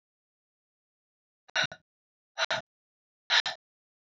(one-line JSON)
{"exhalation_length": "4.0 s", "exhalation_amplitude": 7997, "exhalation_signal_mean_std_ratio": 0.25, "survey_phase": "beta (2021-08-13 to 2022-03-07)", "age": "18-44", "gender": "Female", "wearing_mask": "No", "symptom_cough_any": true, "symptom_runny_or_blocked_nose": true, "symptom_shortness_of_breath": true, "symptom_sore_throat": true, "symptom_fatigue": true, "symptom_fever_high_temperature": true, "symptom_headache": true, "smoker_status": "Never smoked", "recruitment_source": "Test and Trace", "submission_delay": "2 days", "covid_test_result": "Positive", "covid_test_method": "RT-qPCR", "covid_ct_value": 14.5, "covid_ct_gene": "ORF1ab gene"}